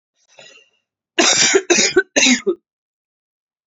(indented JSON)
{
  "three_cough_length": "3.7 s",
  "three_cough_amplitude": 31752,
  "three_cough_signal_mean_std_ratio": 0.44,
  "survey_phase": "beta (2021-08-13 to 2022-03-07)",
  "age": "18-44",
  "gender": "Female",
  "wearing_mask": "No",
  "symptom_cough_any": true,
  "symptom_runny_or_blocked_nose": true,
  "symptom_sore_throat": true,
  "symptom_fatigue": true,
  "symptom_change_to_sense_of_smell_or_taste": true,
  "symptom_onset": "7 days",
  "smoker_status": "Never smoked",
  "respiratory_condition_asthma": true,
  "respiratory_condition_other": false,
  "recruitment_source": "Test and Trace",
  "submission_delay": "3 days",
  "covid_test_result": "Positive",
  "covid_test_method": "RT-qPCR"
}